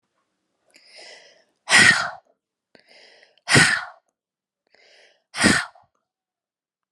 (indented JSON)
{
  "exhalation_length": "6.9 s",
  "exhalation_amplitude": 30581,
  "exhalation_signal_mean_std_ratio": 0.29,
  "survey_phase": "beta (2021-08-13 to 2022-03-07)",
  "age": "18-44",
  "gender": "Female",
  "wearing_mask": "No",
  "symptom_runny_or_blocked_nose": true,
  "symptom_headache": true,
  "smoker_status": "Ex-smoker",
  "respiratory_condition_asthma": false,
  "respiratory_condition_other": false,
  "recruitment_source": "Test and Trace",
  "submission_delay": "1 day",
  "covid_test_result": "Positive",
  "covid_test_method": "RT-qPCR"
}